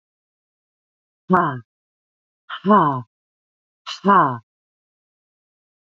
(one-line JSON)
{"exhalation_length": "5.8 s", "exhalation_amplitude": 28412, "exhalation_signal_mean_std_ratio": 0.31, "survey_phase": "beta (2021-08-13 to 2022-03-07)", "age": "45-64", "gender": "Female", "wearing_mask": "No", "symptom_cough_any": true, "symptom_runny_or_blocked_nose": true, "symptom_shortness_of_breath": true, "symptom_abdominal_pain": true, "symptom_diarrhoea": true, "symptom_fatigue": true, "symptom_fever_high_temperature": true, "symptom_headache": true, "symptom_other": true, "symptom_onset": "3 days", "smoker_status": "Never smoked", "respiratory_condition_asthma": false, "respiratory_condition_other": false, "recruitment_source": "Test and Trace", "submission_delay": "2 days", "covid_test_result": "Positive", "covid_test_method": "RT-qPCR", "covid_ct_value": 23.3, "covid_ct_gene": "ORF1ab gene"}